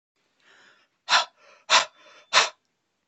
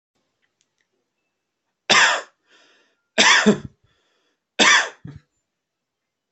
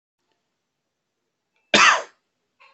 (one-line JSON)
{"exhalation_length": "3.1 s", "exhalation_amplitude": 21603, "exhalation_signal_mean_std_ratio": 0.29, "three_cough_length": "6.3 s", "three_cough_amplitude": 29136, "three_cough_signal_mean_std_ratio": 0.31, "cough_length": "2.7 s", "cough_amplitude": 25191, "cough_signal_mean_std_ratio": 0.24, "survey_phase": "beta (2021-08-13 to 2022-03-07)", "age": "18-44", "gender": "Male", "wearing_mask": "No", "symptom_runny_or_blocked_nose": true, "symptom_onset": "5 days", "smoker_status": "Never smoked", "respiratory_condition_asthma": false, "respiratory_condition_other": false, "recruitment_source": "REACT", "submission_delay": "1 day", "covid_test_result": "Negative", "covid_test_method": "RT-qPCR"}